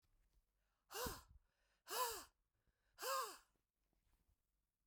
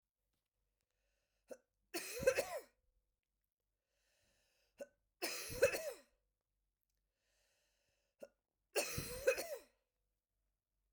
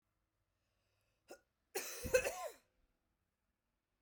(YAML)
exhalation_length: 4.9 s
exhalation_amplitude: 1062
exhalation_signal_mean_std_ratio: 0.36
three_cough_length: 10.9 s
three_cough_amplitude: 3738
three_cough_signal_mean_std_ratio: 0.28
cough_length: 4.0 s
cough_amplitude: 3774
cough_signal_mean_std_ratio: 0.26
survey_phase: beta (2021-08-13 to 2022-03-07)
age: 45-64
gender: Female
wearing_mask: 'No'
symptom_cough_any: true
symptom_runny_or_blocked_nose: true
symptom_diarrhoea: true
symptom_headache: true
symptom_onset: 2 days
smoker_status: Never smoked
respiratory_condition_asthma: false
respiratory_condition_other: false
recruitment_source: Test and Trace
submission_delay: 1 day
covid_test_result: Positive
covid_test_method: RT-qPCR